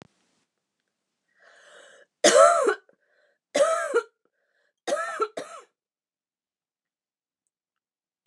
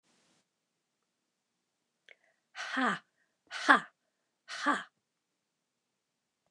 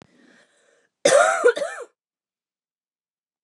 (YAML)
three_cough_length: 8.3 s
three_cough_amplitude: 21995
three_cough_signal_mean_std_ratio: 0.29
exhalation_length: 6.5 s
exhalation_amplitude: 17525
exhalation_signal_mean_std_ratio: 0.23
cough_length: 3.4 s
cough_amplitude: 23565
cough_signal_mean_std_ratio: 0.32
survey_phase: beta (2021-08-13 to 2022-03-07)
age: 45-64
gender: Female
wearing_mask: 'No'
symptom_runny_or_blocked_nose: true
symptom_onset: 8 days
smoker_status: Ex-smoker
respiratory_condition_asthma: true
respiratory_condition_other: false
recruitment_source: REACT
submission_delay: 1 day
covid_test_result: Negative
covid_test_method: RT-qPCR
influenza_a_test_result: Negative
influenza_b_test_result: Negative